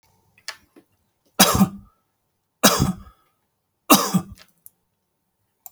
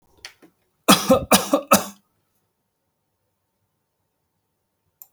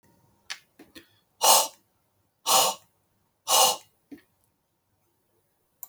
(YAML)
three_cough_length: 5.7 s
three_cough_amplitude: 32768
three_cough_signal_mean_std_ratio: 0.29
cough_length: 5.1 s
cough_amplitude: 32768
cough_signal_mean_std_ratio: 0.26
exhalation_length: 5.9 s
exhalation_amplitude: 20760
exhalation_signal_mean_std_ratio: 0.3
survey_phase: alpha (2021-03-01 to 2021-08-12)
age: 45-64
gender: Male
wearing_mask: 'No'
symptom_none: true
smoker_status: Never smoked
respiratory_condition_asthma: false
respiratory_condition_other: false
recruitment_source: REACT
submission_delay: 4 days
covid_test_result: Negative
covid_test_method: RT-qPCR